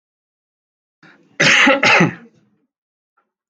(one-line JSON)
{"cough_length": "3.5 s", "cough_amplitude": 32767, "cough_signal_mean_std_ratio": 0.37, "survey_phase": "alpha (2021-03-01 to 2021-08-12)", "age": "18-44", "gender": "Male", "wearing_mask": "No", "symptom_none": true, "smoker_status": "Never smoked", "respiratory_condition_asthma": false, "respiratory_condition_other": false, "recruitment_source": "REACT", "submission_delay": "2 days", "covid_test_result": "Negative", "covid_test_method": "RT-qPCR"}